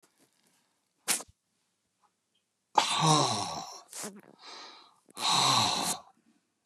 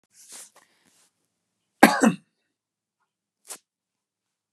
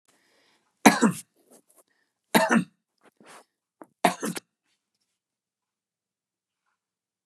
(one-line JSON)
{"exhalation_length": "6.7 s", "exhalation_amplitude": 12806, "exhalation_signal_mean_std_ratio": 0.42, "cough_length": "4.5 s", "cough_amplitude": 32767, "cough_signal_mean_std_ratio": 0.17, "three_cough_length": "7.3 s", "three_cough_amplitude": 30236, "three_cough_signal_mean_std_ratio": 0.22, "survey_phase": "beta (2021-08-13 to 2022-03-07)", "age": "65+", "gender": "Male", "wearing_mask": "No", "symptom_none": true, "smoker_status": "Never smoked", "respiratory_condition_asthma": false, "respiratory_condition_other": false, "recruitment_source": "REACT", "submission_delay": "3 days", "covid_test_result": "Negative", "covid_test_method": "RT-qPCR", "influenza_a_test_result": "Negative", "influenza_b_test_result": "Negative"}